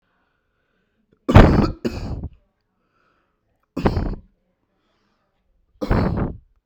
three_cough_length: 6.7 s
three_cough_amplitude: 32768
three_cough_signal_mean_std_ratio: 0.31
survey_phase: beta (2021-08-13 to 2022-03-07)
age: 18-44
gender: Male
wearing_mask: 'No'
symptom_cough_any: true
symptom_fatigue: true
symptom_headache: true
symptom_onset: 4 days
smoker_status: Never smoked
respiratory_condition_asthma: false
respiratory_condition_other: false
recruitment_source: REACT
submission_delay: 1 day
covid_test_result: Negative
covid_test_method: RT-qPCR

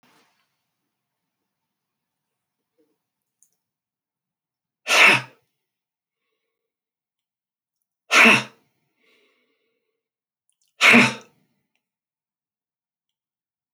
exhalation_length: 13.7 s
exhalation_amplitude: 27736
exhalation_signal_mean_std_ratio: 0.2
survey_phase: alpha (2021-03-01 to 2021-08-12)
age: 65+
gender: Male
wearing_mask: 'No'
symptom_none: true
smoker_status: Ex-smoker
respiratory_condition_asthma: false
respiratory_condition_other: false
recruitment_source: REACT
submission_delay: 2 days
covid_test_result: Negative
covid_test_method: RT-qPCR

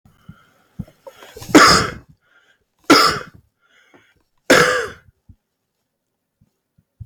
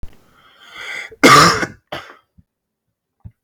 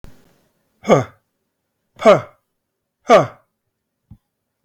three_cough_length: 7.1 s
three_cough_amplitude: 32767
three_cough_signal_mean_std_ratio: 0.31
cough_length: 3.4 s
cough_amplitude: 32768
cough_signal_mean_std_ratio: 0.32
exhalation_length: 4.6 s
exhalation_amplitude: 32768
exhalation_signal_mean_std_ratio: 0.25
survey_phase: beta (2021-08-13 to 2022-03-07)
age: 18-44
gender: Male
wearing_mask: 'No'
symptom_cough_any: true
symptom_sore_throat: true
symptom_change_to_sense_of_smell_or_taste: true
symptom_onset: 3 days
smoker_status: Never smoked
respiratory_condition_asthma: false
respiratory_condition_other: false
recruitment_source: Test and Trace
submission_delay: 2 days
covid_test_result: Positive
covid_test_method: RT-qPCR
covid_ct_value: 18.0
covid_ct_gene: N gene
covid_ct_mean: 18.0
covid_viral_load: 1200000 copies/ml
covid_viral_load_category: High viral load (>1M copies/ml)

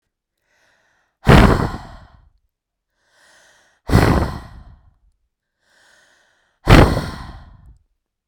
exhalation_length: 8.3 s
exhalation_amplitude: 32768
exhalation_signal_mean_std_ratio: 0.3
survey_phase: beta (2021-08-13 to 2022-03-07)
age: 18-44
gender: Female
wearing_mask: 'No'
symptom_none: true
smoker_status: Ex-smoker
respiratory_condition_asthma: false
respiratory_condition_other: false
recruitment_source: REACT
submission_delay: 1 day
covid_test_result: Negative
covid_test_method: RT-qPCR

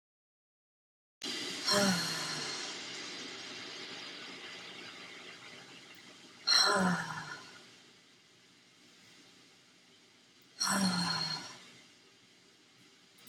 exhalation_length: 13.3 s
exhalation_amplitude: 5861
exhalation_signal_mean_std_ratio: 0.48
survey_phase: beta (2021-08-13 to 2022-03-07)
age: 18-44
gender: Female
wearing_mask: 'No'
symptom_new_continuous_cough: true
symptom_runny_or_blocked_nose: true
symptom_sore_throat: true
symptom_fever_high_temperature: true
symptom_headache: true
symptom_other: true
symptom_onset: 3 days
smoker_status: Never smoked
respiratory_condition_asthma: false
respiratory_condition_other: false
recruitment_source: Test and Trace
submission_delay: 1 day
covid_test_result: Positive
covid_test_method: RT-qPCR
covid_ct_value: 23.5
covid_ct_gene: ORF1ab gene
covid_ct_mean: 23.9
covid_viral_load: 14000 copies/ml
covid_viral_load_category: Low viral load (10K-1M copies/ml)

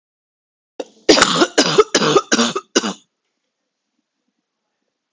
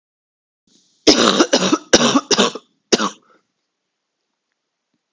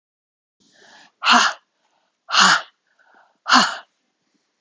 cough_length: 5.1 s
cough_amplitude: 32768
cough_signal_mean_std_ratio: 0.37
three_cough_length: 5.1 s
three_cough_amplitude: 32768
three_cough_signal_mean_std_ratio: 0.37
exhalation_length: 4.6 s
exhalation_amplitude: 32499
exhalation_signal_mean_std_ratio: 0.33
survey_phase: beta (2021-08-13 to 2022-03-07)
age: 18-44
gender: Female
wearing_mask: 'No'
symptom_cough_any: true
symptom_runny_or_blocked_nose: true
symptom_shortness_of_breath: true
symptom_fatigue: true
symptom_change_to_sense_of_smell_or_taste: true
symptom_loss_of_taste: true
symptom_onset: 4 days
smoker_status: Never smoked
respiratory_condition_asthma: false
respiratory_condition_other: false
recruitment_source: Test and Trace
submission_delay: 2 days
covid_test_result: Positive
covid_test_method: RT-qPCR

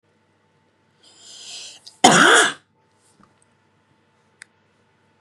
cough_length: 5.2 s
cough_amplitude: 32768
cough_signal_mean_std_ratio: 0.26
survey_phase: beta (2021-08-13 to 2022-03-07)
age: 18-44
gender: Female
wearing_mask: 'No'
symptom_fatigue: true
smoker_status: Never smoked
respiratory_condition_asthma: false
respiratory_condition_other: false
recruitment_source: REACT
submission_delay: 6 days
covid_test_result: Negative
covid_test_method: RT-qPCR
influenza_a_test_result: Negative
influenza_b_test_result: Negative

